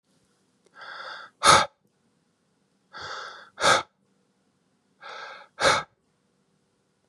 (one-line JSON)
{"exhalation_length": "7.1 s", "exhalation_amplitude": 24892, "exhalation_signal_mean_std_ratio": 0.27, "survey_phase": "beta (2021-08-13 to 2022-03-07)", "age": "18-44", "gender": "Male", "wearing_mask": "No", "symptom_none": true, "smoker_status": "Current smoker (11 or more cigarettes per day)", "respiratory_condition_asthma": false, "respiratory_condition_other": false, "recruitment_source": "REACT", "submission_delay": "4 days", "covid_test_result": "Negative", "covid_test_method": "RT-qPCR", "influenza_a_test_result": "Negative", "influenza_b_test_result": "Negative"}